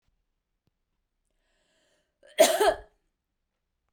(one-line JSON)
{"cough_length": "3.9 s", "cough_amplitude": 15786, "cough_signal_mean_std_ratio": 0.23, "survey_phase": "beta (2021-08-13 to 2022-03-07)", "age": "45-64", "gender": "Female", "wearing_mask": "No", "symptom_none": true, "smoker_status": "Never smoked", "respiratory_condition_asthma": false, "respiratory_condition_other": false, "recruitment_source": "REACT", "submission_delay": "4 days", "covid_test_result": "Negative", "covid_test_method": "RT-qPCR"}